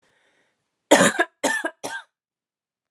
cough_length: 2.9 s
cough_amplitude: 28391
cough_signal_mean_std_ratio: 0.32
survey_phase: alpha (2021-03-01 to 2021-08-12)
age: 18-44
gender: Female
wearing_mask: 'No'
symptom_headache: true
smoker_status: Never smoked
respiratory_condition_asthma: false
respiratory_condition_other: false
recruitment_source: Test and Trace
submission_delay: 1 day
covid_test_result: Positive
covid_test_method: RT-qPCR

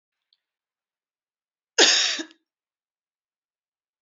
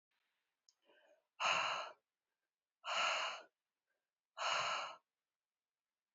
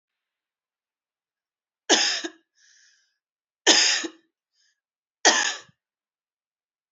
cough_length: 4.0 s
cough_amplitude: 26188
cough_signal_mean_std_ratio: 0.24
exhalation_length: 6.1 s
exhalation_amplitude: 2785
exhalation_signal_mean_std_ratio: 0.41
three_cough_length: 6.9 s
three_cough_amplitude: 28674
three_cough_signal_mean_std_ratio: 0.28
survey_phase: beta (2021-08-13 to 2022-03-07)
age: 45-64
gender: Female
wearing_mask: 'No'
symptom_cough_any: true
symptom_runny_or_blocked_nose: true
symptom_fatigue: true
symptom_fever_high_temperature: true
symptom_headache: true
symptom_onset: 3 days
smoker_status: Never smoked
respiratory_condition_asthma: false
respiratory_condition_other: false
recruitment_source: Test and Trace
submission_delay: 2 days
covid_test_result: Positive
covid_test_method: RT-qPCR
covid_ct_value: 17.6
covid_ct_gene: ORF1ab gene
covid_ct_mean: 18.0
covid_viral_load: 1300000 copies/ml
covid_viral_load_category: High viral load (>1M copies/ml)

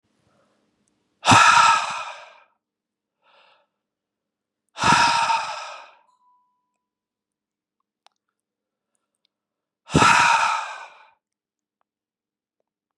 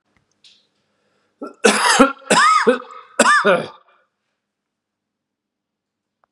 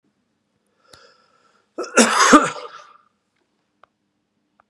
exhalation_length: 13.0 s
exhalation_amplitude: 29045
exhalation_signal_mean_std_ratio: 0.32
three_cough_length: 6.3 s
three_cough_amplitude: 32767
three_cough_signal_mean_std_ratio: 0.38
cough_length: 4.7 s
cough_amplitude: 32767
cough_signal_mean_std_ratio: 0.27
survey_phase: beta (2021-08-13 to 2022-03-07)
age: 45-64
gender: Male
wearing_mask: 'No'
symptom_none: true
smoker_status: Ex-smoker
respiratory_condition_asthma: false
respiratory_condition_other: false
recruitment_source: REACT
submission_delay: 4 days
covid_test_result: Negative
covid_test_method: RT-qPCR
influenza_a_test_result: Negative
influenza_b_test_result: Negative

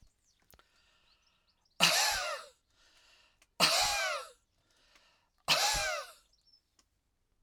three_cough_length: 7.4 s
three_cough_amplitude: 11576
three_cough_signal_mean_std_ratio: 0.39
survey_phase: alpha (2021-03-01 to 2021-08-12)
age: 65+
gender: Male
wearing_mask: 'No'
symptom_none: true
smoker_status: Ex-smoker
respiratory_condition_asthma: false
respiratory_condition_other: false
recruitment_source: REACT
submission_delay: 1 day
covid_test_result: Negative
covid_test_method: RT-qPCR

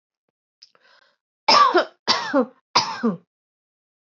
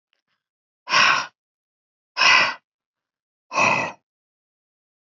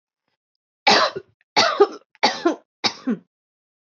cough_length: 4.1 s
cough_amplitude: 24367
cough_signal_mean_std_ratio: 0.38
exhalation_length: 5.1 s
exhalation_amplitude: 24986
exhalation_signal_mean_std_ratio: 0.35
three_cough_length: 3.8 s
three_cough_amplitude: 24967
three_cough_signal_mean_std_ratio: 0.39
survey_phase: alpha (2021-03-01 to 2021-08-12)
age: 45-64
gender: Female
wearing_mask: 'No'
symptom_none: true
symptom_onset: 13 days
smoker_status: Ex-smoker
respiratory_condition_asthma: false
respiratory_condition_other: false
recruitment_source: REACT
submission_delay: 2 days
covid_test_result: Negative
covid_test_method: RT-qPCR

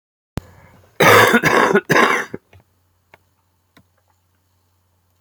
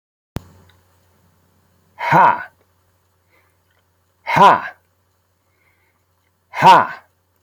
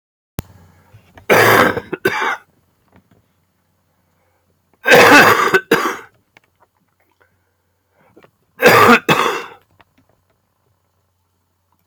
cough_length: 5.2 s
cough_amplitude: 32767
cough_signal_mean_std_ratio: 0.37
exhalation_length: 7.4 s
exhalation_amplitude: 32768
exhalation_signal_mean_std_ratio: 0.29
three_cough_length: 11.9 s
three_cough_amplitude: 32768
three_cough_signal_mean_std_ratio: 0.36
survey_phase: alpha (2021-03-01 to 2021-08-12)
age: 65+
gender: Male
wearing_mask: 'No'
symptom_cough_any: true
symptom_onset: 8 days
smoker_status: Never smoked
respiratory_condition_asthma: false
respiratory_condition_other: false
recruitment_source: REACT
submission_delay: 2 days
covid_test_result: Negative
covid_test_method: RT-qPCR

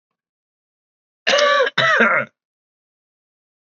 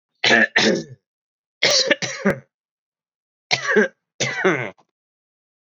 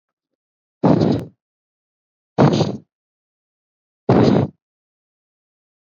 cough_length: 3.7 s
cough_amplitude: 25609
cough_signal_mean_std_ratio: 0.41
three_cough_length: 5.6 s
three_cough_amplitude: 28388
three_cough_signal_mean_std_ratio: 0.44
exhalation_length: 6.0 s
exhalation_amplitude: 29805
exhalation_signal_mean_std_ratio: 0.34
survey_phase: alpha (2021-03-01 to 2021-08-12)
age: 18-44
gender: Male
wearing_mask: 'No'
symptom_cough_any: true
symptom_change_to_sense_of_smell_or_taste: true
smoker_status: Never smoked
respiratory_condition_asthma: true
respiratory_condition_other: false
recruitment_source: Test and Trace
submission_delay: 1 day
covid_test_result: Positive
covid_test_method: RT-qPCR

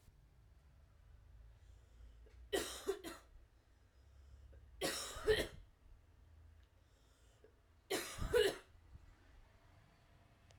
three_cough_length: 10.6 s
three_cough_amplitude: 2760
three_cough_signal_mean_std_ratio: 0.36
survey_phase: alpha (2021-03-01 to 2021-08-12)
age: 18-44
gender: Female
wearing_mask: 'No'
symptom_cough_any: true
symptom_shortness_of_breath: true
symptom_fatigue: true
symptom_fever_high_temperature: true
symptom_headache: true
symptom_onset: 3 days
smoker_status: Never smoked
respiratory_condition_asthma: false
respiratory_condition_other: false
recruitment_source: Test and Trace
submission_delay: 1 day
covid_test_result: Positive
covid_test_method: RT-qPCR
covid_ct_value: 23.7
covid_ct_gene: N gene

